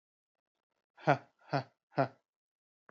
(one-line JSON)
{"exhalation_length": "2.9 s", "exhalation_amplitude": 7592, "exhalation_signal_mean_std_ratio": 0.22, "survey_phase": "alpha (2021-03-01 to 2021-08-12)", "age": "18-44", "gender": "Male", "wearing_mask": "No", "symptom_cough_any": true, "symptom_shortness_of_breath": true, "symptom_fatigue": true, "symptom_headache": true, "smoker_status": "Never smoked", "respiratory_condition_asthma": false, "respiratory_condition_other": false, "recruitment_source": "Test and Trace", "submission_delay": "1 day", "covid_test_result": "Positive", "covid_test_method": "RT-qPCR", "covid_ct_value": 20.3, "covid_ct_gene": "ORF1ab gene", "covid_ct_mean": 21.3, "covid_viral_load": "100000 copies/ml", "covid_viral_load_category": "Low viral load (10K-1M copies/ml)"}